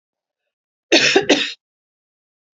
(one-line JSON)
{"cough_length": "2.6 s", "cough_amplitude": 30402, "cough_signal_mean_std_ratio": 0.34, "survey_phase": "beta (2021-08-13 to 2022-03-07)", "age": "45-64", "gender": "Female", "wearing_mask": "No", "symptom_cough_any": true, "symptom_runny_or_blocked_nose": true, "symptom_change_to_sense_of_smell_or_taste": true, "symptom_onset": "2 days", "smoker_status": "Never smoked", "respiratory_condition_asthma": false, "respiratory_condition_other": false, "recruitment_source": "Test and Trace", "submission_delay": "2 days", "covid_test_result": "Positive", "covid_test_method": "RT-qPCR"}